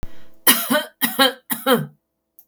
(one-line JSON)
{"three_cough_length": "2.5 s", "three_cough_amplitude": 32768, "three_cough_signal_mean_std_ratio": 0.5, "survey_phase": "beta (2021-08-13 to 2022-03-07)", "age": "45-64", "gender": "Female", "wearing_mask": "No", "symptom_none": true, "smoker_status": "Never smoked", "respiratory_condition_asthma": false, "respiratory_condition_other": false, "recruitment_source": "REACT", "submission_delay": "1 day", "covid_test_result": "Negative", "covid_test_method": "RT-qPCR", "influenza_a_test_result": "Unknown/Void", "influenza_b_test_result": "Unknown/Void"}